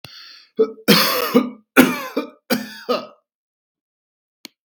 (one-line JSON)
{"three_cough_length": "4.6 s", "three_cough_amplitude": 32768, "three_cough_signal_mean_std_ratio": 0.4, "survey_phase": "beta (2021-08-13 to 2022-03-07)", "age": "45-64", "gender": "Male", "wearing_mask": "No", "symptom_none": true, "smoker_status": "Never smoked", "respiratory_condition_asthma": false, "respiratory_condition_other": false, "recruitment_source": "REACT", "submission_delay": "16 days", "covid_test_result": "Negative", "covid_test_method": "RT-qPCR"}